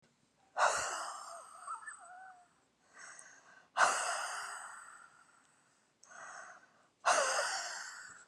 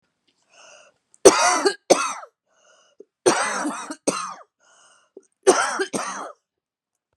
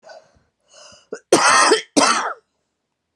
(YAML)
exhalation_length: 8.3 s
exhalation_amplitude: 6057
exhalation_signal_mean_std_ratio: 0.46
three_cough_length: 7.2 s
three_cough_amplitude: 32768
three_cough_signal_mean_std_ratio: 0.36
cough_length: 3.2 s
cough_amplitude: 32271
cough_signal_mean_std_ratio: 0.42
survey_phase: beta (2021-08-13 to 2022-03-07)
age: 45-64
gender: Female
wearing_mask: 'No'
symptom_runny_or_blocked_nose: true
symptom_fatigue: true
smoker_status: Ex-smoker
respiratory_condition_asthma: false
respiratory_condition_other: false
recruitment_source: REACT
submission_delay: 1 day
covid_test_result: Negative
covid_test_method: RT-qPCR